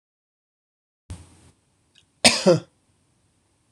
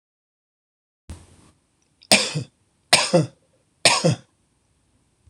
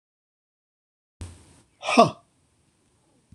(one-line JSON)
{"cough_length": "3.7 s", "cough_amplitude": 26027, "cough_signal_mean_std_ratio": 0.22, "three_cough_length": "5.3 s", "three_cough_amplitude": 26028, "three_cough_signal_mean_std_ratio": 0.3, "exhalation_length": "3.3 s", "exhalation_amplitude": 26027, "exhalation_signal_mean_std_ratio": 0.19, "survey_phase": "beta (2021-08-13 to 2022-03-07)", "age": "45-64", "gender": "Male", "wearing_mask": "No", "symptom_cough_any": true, "symptom_runny_or_blocked_nose": true, "symptom_shortness_of_breath": true, "symptom_sore_throat": true, "symptom_change_to_sense_of_smell_or_taste": true, "symptom_onset": "6 days", "smoker_status": "Never smoked", "respiratory_condition_asthma": false, "respiratory_condition_other": false, "recruitment_source": "REACT", "submission_delay": "5 days", "covid_test_result": "Negative", "covid_test_method": "RT-qPCR"}